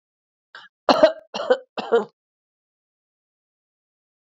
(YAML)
cough_length: 4.3 s
cough_amplitude: 27978
cough_signal_mean_std_ratio: 0.26
survey_phase: alpha (2021-03-01 to 2021-08-12)
age: 18-44
gender: Female
wearing_mask: 'No'
symptom_headache: true
smoker_status: Never smoked
respiratory_condition_asthma: true
respiratory_condition_other: false
recruitment_source: Test and Trace
submission_delay: 2 days
covid_test_result: Positive
covid_test_method: RT-qPCR